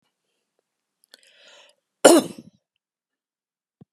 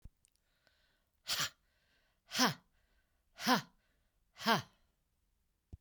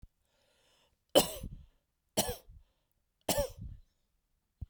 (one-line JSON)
{"cough_length": "3.9 s", "cough_amplitude": 32768, "cough_signal_mean_std_ratio": 0.17, "exhalation_length": "5.8 s", "exhalation_amplitude": 5155, "exhalation_signal_mean_std_ratio": 0.27, "three_cough_length": "4.7 s", "three_cough_amplitude": 11088, "three_cough_signal_mean_std_ratio": 0.27, "survey_phase": "beta (2021-08-13 to 2022-03-07)", "age": "45-64", "gender": "Female", "wearing_mask": "No", "symptom_none": true, "smoker_status": "Ex-smoker", "respiratory_condition_asthma": false, "respiratory_condition_other": false, "recruitment_source": "REACT", "submission_delay": "3 days", "covid_test_result": "Negative", "covid_test_method": "RT-qPCR", "influenza_a_test_result": "Negative", "influenza_b_test_result": "Negative"}